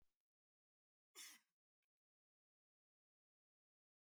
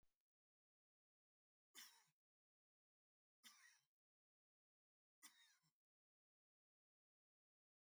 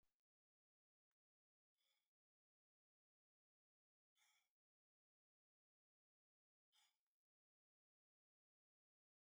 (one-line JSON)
{"cough_length": "4.0 s", "cough_amplitude": 185, "cough_signal_mean_std_ratio": 0.19, "three_cough_length": "7.9 s", "three_cough_amplitude": 123, "three_cough_signal_mean_std_ratio": 0.24, "exhalation_length": "9.4 s", "exhalation_amplitude": 17, "exhalation_signal_mean_std_ratio": 0.2, "survey_phase": "beta (2021-08-13 to 2022-03-07)", "age": "65+", "gender": "Male", "wearing_mask": "No", "symptom_none": true, "smoker_status": "Ex-smoker", "respiratory_condition_asthma": false, "respiratory_condition_other": false, "recruitment_source": "REACT", "submission_delay": "4 days", "covid_test_result": "Negative", "covid_test_method": "RT-qPCR", "influenza_a_test_result": "Negative", "influenza_b_test_result": "Negative"}